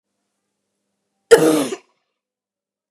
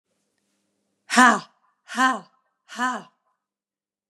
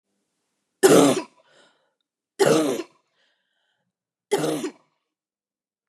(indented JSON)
{
  "cough_length": "2.9 s",
  "cough_amplitude": 32768,
  "cough_signal_mean_std_ratio": 0.26,
  "exhalation_length": "4.1 s",
  "exhalation_amplitude": 30537,
  "exhalation_signal_mean_std_ratio": 0.28,
  "three_cough_length": "5.9 s",
  "three_cough_amplitude": 29066,
  "three_cough_signal_mean_std_ratio": 0.32,
  "survey_phase": "beta (2021-08-13 to 2022-03-07)",
  "age": "18-44",
  "gender": "Female",
  "wearing_mask": "No",
  "symptom_cough_any": true,
  "symptom_new_continuous_cough": true,
  "symptom_runny_or_blocked_nose": true,
  "symptom_sore_throat": true,
  "symptom_fatigue": true,
  "symptom_headache": true,
  "symptom_change_to_sense_of_smell_or_taste": true,
  "symptom_other": true,
  "symptom_onset": "4 days",
  "smoker_status": "Ex-smoker",
  "respiratory_condition_asthma": false,
  "respiratory_condition_other": false,
  "recruitment_source": "Test and Trace",
  "submission_delay": "2 days",
  "covid_test_result": "Positive",
  "covid_test_method": "RT-qPCR",
  "covid_ct_value": 31.4,
  "covid_ct_gene": "ORF1ab gene",
  "covid_ct_mean": 31.9,
  "covid_viral_load": "33 copies/ml",
  "covid_viral_load_category": "Minimal viral load (< 10K copies/ml)"
}